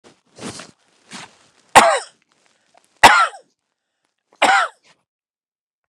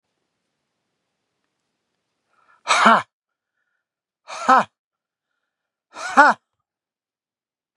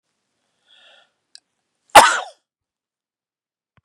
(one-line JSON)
{"three_cough_length": "5.9 s", "three_cough_amplitude": 32768, "three_cough_signal_mean_std_ratio": 0.28, "exhalation_length": "7.8 s", "exhalation_amplitude": 32768, "exhalation_signal_mean_std_ratio": 0.23, "cough_length": "3.8 s", "cough_amplitude": 32768, "cough_signal_mean_std_ratio": 0.18, "survey_phase": "beta (2021-08-13 to 2022-03-07)", "age": "65+", "gender": "Male", "wearing_mask": "No", "symptom_none": true, "smoker_status": "Never smoked", "respiratory_condition_asthma": false, "respiratory_condition_other": false, "recruitment_source": "REACT", "submission_delay": "3 days", "covid_test_result": "Negative", "covid_test_method": "RT-qPCR"}